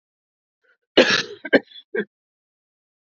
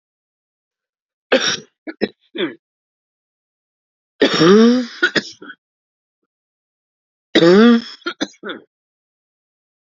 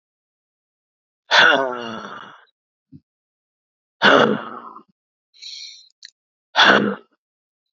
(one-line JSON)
{"cough_length": "3.2 s", "cough_amplitude": 28016, "cough_signal_mean_std_ratio": 0.26, "three_cough_length": "9.9 s", "three_cough_amplitude": 30273, "three_cough_signal_mean_std_ratio": 0.33, "exhalation_length": "7.8 s", "exhalation_amplitude": 29173, "exhalation_signal_mean_std_ratio": 0.33, "survey_phase": "beta (2021-08-13 to 2022-03-07)", "age": "45-64", "gender": "Female", "wearing_mask": "Yes", "symptom_cough_any": true, "symptom_runny_or_blocked_nose": true, "symptom_sore_throat": true, "symptom_fatigue": true, "symptom_headache": true, "symptom_other": true, "symptom_onset": "5 days", "smoker_status": "Ex-smoker", "respiratory_condition_asthma": true, "respiratory_condition_other": false, "recruitment_source": "Test and Trace", "submission_delay": "1 day", "covid_test_result": "Positive", "covid_test_method": "ePCR"}